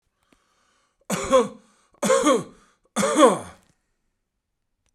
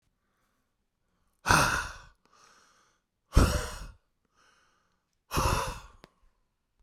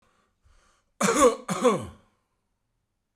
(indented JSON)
{
  "three_cough_length": "4.9 s",
  "three_cough_amplitude": 27051,
  "three_cough_signal_mean_std_ratio": 0.38,
  "exhalation_length": "6.8 s",
  "exhalation_amplitude": 16666,
  "exhalation_signal_mean_std_ratio": 0.31,
  "cough_length": "3.2 s",
  "cough_amplitude": 13752,
  "cough_signal_mean_std_ratio": 0.36,
  "survey_phase": "beta (2021-08-13 to 2022-03-07)",
  "age": "45-64",
  "gender": "Male",
  "wearing_mask": "No",
  "symptom_diarrhoea": true,
  "symptom_fatigue": true,
  "symptom_onset": "12 days",
  "smoker_status": "Ex-smoker",
  "respiratory_condition_asthma": false,
  "respiratory_condition_other": false,
  "recruitment_source": "REACT",
  "submission_delay": "2 days",
  "covid_test_result": "Negative",
  "covid_test_method": "RT-qPCR"
}